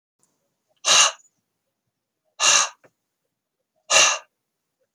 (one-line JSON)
{"exhalation_length": "4.9 s", "exhalation_amplitude": 26539, "exhalation_signal_mean_std_ratio": 0.32, "survey_phase": "beta (2021-08-13 to 2022-03-07)", "age": "45-64", "gender": "Male", "wearing_mask": "No", "symptom_fatigue": true, "symptom_onset": "12 days", "smoker_status": "Never smoked", "respiratory_condition_asthma": false, "respiratory_condition_other": false, "recruitment_source": "REACT", "submission_delay": "2 days", "covid_test_result": "Negative", "covid_test_method": "RT-qPCR", "influenza_a_test_result": "Negative", "influenza_b_test_result": "Negative"}